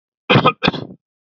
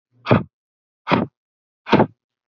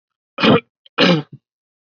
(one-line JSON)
{"cough_length": "1.3 s", "cough_amplitude": 32768, "cough_signal_mean_std_ratio": 0.41, "exhalation_length": "2.5 s", "exhalation_amplitude": 27915, "exhalation_signal_mean_std_ratio": 0.32, "three_cough_length": "1.9 s", "three_cough_amplitude": 30331, "three_cough_signal_mean_std_ratio": 0.4, "survey_phase": "beta (2021-08-13 to 2022-03-07)", "age": "18-44", "gender": "Male", "wearing_mask": "No", "symptom_none": true, "smoker_status": "Never smoked", "respiratory_condition_asthma": false, "respiratory_condition_other": false, "recruitment_source": "REACT", "submission_delay": "1 day", "covid_test_result": "Negative", "covid_test_method": "RT-qPCR"}